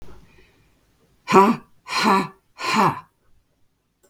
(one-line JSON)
{"exhalation_length": "4.1 s", "exhalation_amplitude": 32766, "exhalation_signal_mean_std_ratio": 0.38, "survey_phase": "beta (2021-08-13 to 2022-03-07)", "age": "65+", "gender": "Female", "wearing_mask": "No", "symptom_none": true, "smoker_status": "Never smoked", "respiratory_condition_asthma": false, "respiratory_condition_other": false, "recruitment_source": "REACT", "submission_delay": "1 day", "covid_test_result": "Negative", "covid_test_method": "RT-qPCR"}